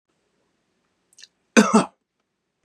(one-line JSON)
{"cough_length": "2.6 s", "cough_amplitude": 30640, "cough_signal_mean_std_ratio": 0.23, "survey_phase": "beta (2021-08-13 to 2022-03-07)", "age": "45-64", "gender": "Male", "wearing_mask": "No", "symptom_none": true, "smoker_status": "Never smoked", "respiratory_condition_asthma": false, "respiratory_condition_other": false, "recruitment_source": "REACT", "submission_delay": "1 day", "covid_test_result": "Negative", "covid_test_method": "RT-qPCR", "influenza_a_test_result": "Negative", "influenza_b_test_result": "Negative"}